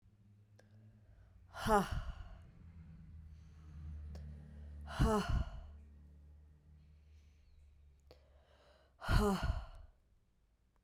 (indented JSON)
{
  "exhalation_length": "10.8 s",
  "exhalation_amplitude": 4553,
  "exhalation_signal_mean_std_ratio": 0.41,
  "survey_phase": "beta (2021-08-13 to 2022-03-07)",
  "age": "18-44",
  "gender": "Female",
  "wearing_mask": "No",
  "symptom_cough_any": true,
  "symptom_runny_or_blocked_nose": true,
  "symptom_onset": "3 days",
  "smoker_status": "Never smoked",
  "respiratory_condition_asthma": false,
  "respiratory_condition_other": false,
  "recruitment_source": "Test and Trace",
  "submission_delay": "2 days",
  "covid_test_result": "Positive",
  "covid_test_method": "RT-qPCR",
  "covid_ct_value": 17.7,
  "covid_ct_gene": "ORF1ab gene"
}